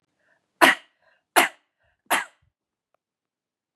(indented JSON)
{
  "three_cough_length": "3.8 s",
  "three_cough_amplitude": 32767,
  "three_cough_signal_mean_std_ratio": 0.22,
  "survey_phase": "beta (2021-08-13 to 2022-03-07)",
  "age": "45-64",
  "gender": "Female",
  "wearing_mask": "No",
  "symptom_none": true,
  "smoker_status": "Ex-smoker",
  "respiratory_condition_asthma": false,
  "respiratory_condition_other": false,
  "recruitment_source": "REACT",
  "submission_delay": "2 days",
  "covid_test_result": "Negative",
  "covid_test_method": "RT-qPCR",
  "influenza_a_test_result": "Negative",
  "influenza_b_test_result": "Negative"
}